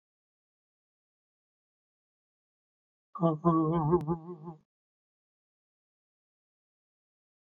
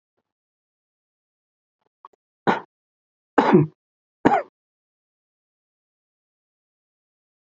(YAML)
exhalation_length: 7.6 s
exhalation_amplitude: 7451
exhalation_signal_mean_std_ratio: 0.28
three_cough_length: 7.5 s
three_cough_amplitude: 26936
three_cough_signal_mean_std_ratio: 0.2
survey_phase: beta (2021-08-13 to 2022-03-07)
age: 45-64
gender: Male
wearing_mask: 'No'
symptom_none: true
smoker_status: Never smoked
respiratory_condition_asthma: false
respiratory_condition_other: false
recruitment_source: REACT
submission_delay: 1 day
covid_test_result: Negative
covid_test_method: RT-qPCR
influenza_a_test_result: Unknown/Void
influenza_b_test_result: Unknown/Void